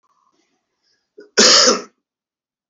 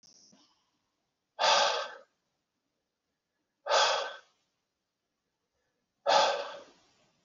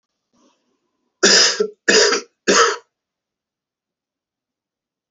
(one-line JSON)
{"cough_length": "2.7 s", "cough_amplitude": 32768, "cough_signal_mean_std_ratio": 0.32, "exhalation_length": "7.2 s", "exhalation_amplitude": 8737, "exhalation_signal_mean_std_ratio": 0.34, "three_cough_length": "5.1 s", "three_cough_amplitude": 32768, "three_cough_signal_mean_std_ratio": 0.36, "survey_phase": "alpha (2021-03-01 to 2021-08-12)", "age": "18-44", "gender": "Male", "wearing_mask": "No", "symptom_cough_any": true, "symptom_fatigue": true, "symptom_headache": true, "symptom_change_to_sense_of_smell_or_taste": true, "symptom_loss_of_taste": true, "smoker_status": "Current smoker (1 to 10 cigarettes per day)", "respiratory_condition_asthma": false, "respiratory_condition_other": false, "recruitment_source": "Test and Trace", "submission_delay": "3 days", "covid_test_result": "Positive", "covid_test_method": "RT-qPCR", "covid_ct_value": 21.6, "covid_ct_gene": "ORF1ab gene"}